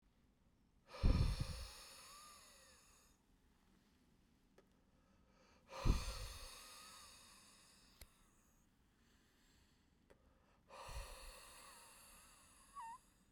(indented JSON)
{
  "exhalation_length": "13.3 s",
  "exhalation_amplitude": 2858,
  "exhalation_signal_mean_std_ratio": 0.3,
  "survey_phase": "beta (2021-08-13 to 2022-03-07)",
  "age": "18-44",
  "gender": "Male",
  "wearing_mask": "No",
  "symptom_runny_or_blocked_nose": true,
  "symptom_change_to_sense_of_smell_or_taste": true,
  "symptom_onset": "2 days",
  "smoker_status": "Ex-smoker",
  "respiratory_condition_asthma": false,
  "respiratory_condition_other": false,
  "recruitment_source": "Test and Trace",
  "submission_delay": "1 day",
  "covid_test_result": "Positive",
  "covid_test_method": "RT-qPCR",
  "covid_ct_value": 23.4,
  "covid_ct_gene": "ORF1ab gene"
}